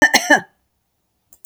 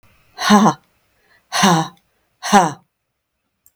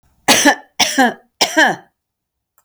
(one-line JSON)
{"cough_length": "1.5 s", "cough_amplitude": 32768, "cough_signal_mean_std_ratio": 0.33, "exhalation_length": "3.8 s", "exhalation_amplitude": 32766, "exhalation_signal_mean_std_ratio": 0.38, "three_cough_length": "2.6 s", "three_cough_amplitude": 32768, "three_cough_signal_mean_std_ratio": 0.45, "survey_phase": "beta (2021-08-13 to 2022-03-07)", "age": "65+", "gender": "Female", "wearing_mask": "No", "symptom_none": true, "smoker_status": "Never smoked", "respiratory_condition_asthma": false, "respiratory_condition_other": false, "recruitment_source": "REACT", "submission_delay": "1 day", "covid_test_result": "Negative", "covid_test_method": "RT-qPCR", "influenza_a_test_result": "Negative", "influenza_b_test_result": "Negative"}